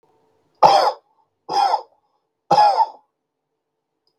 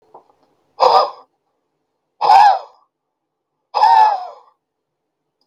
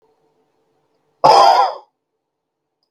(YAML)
three_cough_length: 4.2 s
three_cough_amplitude: 32768
three_cough_signal_mean_std_ratio: 0.39
exhalation_length: 5.5 s
exhalation_amplitude: 32768
exhalation_signal_mean_std_ratio: 0.38
cough_length: 2.9 s
cough_amplitude: 32768
cough_signal_mean_std_ratio: 0.34
survey_phase: beta (2021-08-13 to 2022-03-07)
age: 45-64
gender: Male
wearing_mask: 'No'
symptom_cough_any: true
symptom_runny_or_blocked_nose: true
symptom_shortness_of_breath: true
symptom_onset: 3 days
smoker_status: Never smoked
respiratory_condition_asthma: true
respiratory_condition_other: false
recruitment_source: Test and Trace
submission_delay: 2 days
covid_test_result: Negative
covid_test_method: RT-qPCR